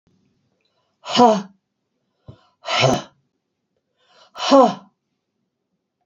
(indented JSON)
{
  "exhalation_length": "6.1 s",
  "exhalation_amplitude": 27976,
  "exhalation_signal_mean_std_ratio": 0.3,
  "survey_phase": "beta (2021-08-13 to 2022-03-07)",
  "age": "65+",
  "gender": "Female",
  "wearing_mask": "No",
  "symptom_none": true,
  "smoker_status": "Ex-smoker",
  "respiratory_condition_asthma": false,
  "respiratory_condition_other": false,
  "recruitment_source": "REACT",
  "submission_delay": "2 days",
  "covid_test_result": "Negative",
  "covid_test_method": "RT-qPCR",
  "influenza_a_test_result": "Negative",
  "influenza_b_test_result": "Negative"
}